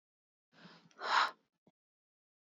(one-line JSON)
{"exhalation_length": "2.6 s", "exhalation_amplitude": 4065, "exhalation_signal_mean_std_ratio": 0.26, "survey_phase": "beta (2021-08-13 to 2022-03-07)", "age": "45-64", "gender": "Female", "wearing_mask": "No", "symptom_cough_any": true, "symptom_shortness_of_breath": true, "symptom_sore_throat": true, "symptom_fatigue": true, "symptom_change_to_sense_of_smell_or_taste": true, "symptom_loss_of_taste": true, "smoker_status": "Never smoked", "respiratory_condition_asthma": false, "respiratory_condition_other": false, "recruitment_source": "Test and Trace", "submission_delay": "2 days", "covid_test_result": "Positive", "covid_test_method": "LFT"}